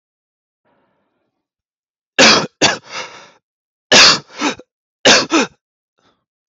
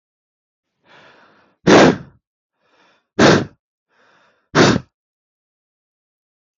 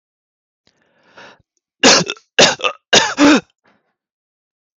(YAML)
cough_length: 6.5 s
cough_amplitude: 32768
cough_signal_mean_std_ratio: 0.34
exhalation_length: 6.6 s
exhalation_amplitude: 32768
exhalation_signal_mean_std_ratio: 0.28
three_cough_length: 4.8 s
three_cough_amplitude: 32768
three_cough_signal_mean_std_ratio: 0.34
survey_phase: alpha (2021-03-01 to 2021-08-12)
age: 18-44
gender: Male
wearing_mask: 'No'
symptom_none: true
smoker_status: Never smoked
respiratory_condition_asthma: false
respiratory_condition_other: false
recruitment_source: REACT
submission_delay: 2 days
covid_test_result: Negative
covid_test_method: RT-qPCR